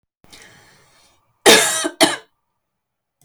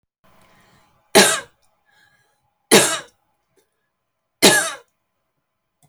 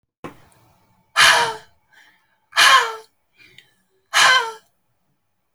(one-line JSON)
{"cough_length": "3.2 s", "cough_amplitude": 32767, "cough_signal_mean_std_ratio": 0.31, "three_cough_length": "5.9 s", "three_cough_amplitude": 32768, "three_cough_signal_mean_std_ratio": 0.27, "exhalation_length": "5.5 s", "exhalation_amplitude": 31777, "exhalation_signal_mean_std_ratio": 0.35, "survey_phase": "alpha (2021-03-01 to 2021-08-12)", "age": "18-44", "gender": "Female", "wearing_mask": "No", "symptom_none": true, "smoker_status": "Never smoked", "respiratory_condition_asthma": true, "respiratory_condition_other": false, "recruitment_source": "REACT", "submission_delay": "2 days", "covid_test_result": "Negative", "covid_test_method": "RT-qPCR"}